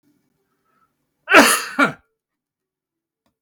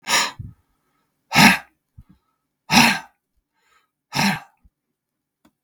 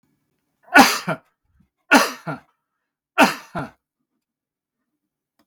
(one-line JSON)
{"cough_length": "3.4 s", "cough_amplitude": 32768, "cough_signal_mean_std_ratio": 0.27, "exhalation_length": "5.6 s", "exhalation_amplitude": 32768, "exhalation_signal_mean_std_ratio": 0.31, "three_cough_length": "5.5 s", "three_cough_amplitude": 32768, "three_cough_signal_mean_std_ratio": 0.27, "survey_phase": "beta (2021-08-13 to 2022-03-07)", "age": "65+", "gender": "Male", "wearing_mask": "No", "symptom_none": true, "smoker_status": "Ex-smoker", "respiratory_condition_asthma": false, "respiratory_condition_other": false, "recruitment_source": "REACT", "submission_delay": "2 days", "covid_test_result": "Negative", "covid_test_method": "RT-qPCR", "influenza_a_test_result": "Negative", "influenza_b_test_result": "Negative"}